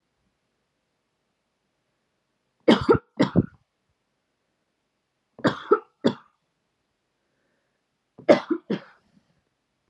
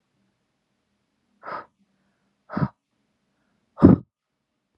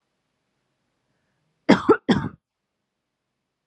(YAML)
three_cough_length: 9.9 s
three_cough_amplitude: 25672
three_cough_signal_mean_std_ratio: 0.22
exhalation_length: 4.8 s
exhalation_amplitude: 32520
exhalation_signal_mean_std_ratio: 0.17
cough_length: 3.7 s
cough_amplitude: 32179
cough_signal_mean_std_ratio: 0.22
survey_phase: alpha (2021-03-01 to 2021-08-12)
age: 18-44
gender: Female
wearing_mask: 'No'
symptom_none: true
smoker_status: Never smoked
respiratory_condition_asthma: false
respiratory_condition_other: false
recruitment_source: REACT
submission_delay: 1 day
covid_test_result: Negative
covid_test_method: RT-qPCR